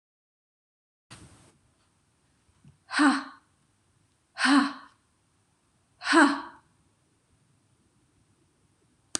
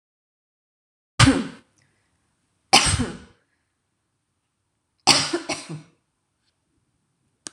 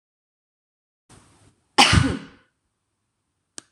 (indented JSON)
{
  "exhalation_length": "9.2 s",
  "exhalation_amplitude": 17932,
  "exhalation_signal_mean_std_ratio": 0.26,
  "three_cough_length": "7.5 s",
  "three_cough_amplitude": 26028,
  "three_cough_signal_mean_std_ratio": 0.26,
  "cough_length": "3.7 s",
  "cough_amplitude": 26028,
  "cough_signal_mean_std_ratio": 0.24,
  "survey_phase": "beta (2021-08-13 to 2022-03-07)",
  "age": "45-64",
  "gender": "Female",
  "wearing_mask": "No",
  "symptom_none": true,
  "smoker_status": "Never smoked",
  "respiratory_condition_asthma": false,
  "respiratory_condition_other": false,
  "recruitment_source": "REACT",
  "submission_delay": "1 day",
  "covid_test_result": "Negative",
  "covid_test_method": "RT-qPCR"
}